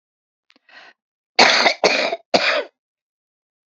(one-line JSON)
{"cough_length": "3.7 s", "cough_amplitude": 32768, "cough_signal_mean_std_ratio": 0.39, "survey_phase": "beta (2021-08-13 to 2022-03-07)", "age": "65+", "gender": "Female", "wearing_mask": "No", "symptom_cough_any": true, "symptom_fatigue": true, "smoker_status": "Ex-smoker", "respiratory_condition_asthma": false, "respiratory_condition_other": false, "recruitment_source": "REACT", "submission_delay": "1 day", "covid_test_result": "Negative", "covid_test_method": "RT-qPCR"}